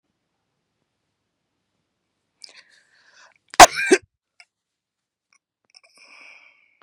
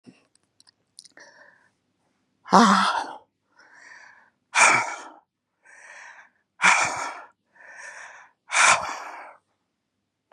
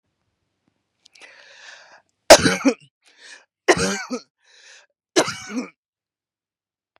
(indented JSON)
{
  "cough_length": "6.8 s",
  "cough_amplitude": 32768,
  "cough_signal_mean_std_ratio": 0.13,
  "exhalation_length": "10.3 s",
  "exhalation_amplitude": 31281,
  "exhalation_signal_mean_std_ratio": 0.33,
  "three_cough_length": "7.0 s",
  "three_cough_amplitude": 32768,
  "three_cough_signal_mean_std_ratio": 0.24,
  "survey_phase": "beta (2021-08-13 to 2022-03-07)",
  "age": "45-64",
  "gender": "Female",
  "wearing_mask": "No",
  "symptom_none": true,
  "smoker_status": "Never smoked",
  "respiratory_condition_asthma": false,
  "respiratory_condition_other": false,
  "recruitment_source": "REACT",
  "submission_delay": "19 days",
  "covid_test_result": "Negative",
  "covid_test_method": "RT-qPCR",
  "influenza_a_test_result": "Negative",
  "influenza_b_test_result": "Negative"
}